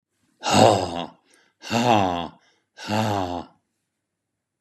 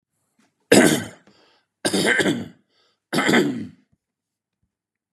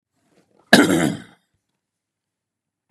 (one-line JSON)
{"exhalation_length": "4.6 s", "exhalation_amplitude": 29362, "exhalation_signal_mean_std_ratio": 0.43, "three_cough_length": "5.1 s", "three_cough_amplitude": 32491, "three_cough_signal_mean_std_ratio": 0.39, "cough_length": "2.9 s", "cough_amplitude": 32768, "cough_signal_mean_std_ratio": 0.27, "survey_phase": "beta (2021-08-13 to 2022-03-07)", "age": "45-64", "gender": "Male", "wearing_mask": "No", "symptom_cough_any": true, "smoker_status": "Never smoked", "respiratory_condition_asthma": false, "respiratory_condition_other": false, "recruitment_source": "REACT", "submission_delay": "1 day", "covid_test_result": "Negative", "covid_test_method": "RT-qPCR", "covid_ct_value": 39.0, "covid_ct_gene": "N gene", "influenza_a_test_result": "Negative", "influenza_b_test_result": "Negative"}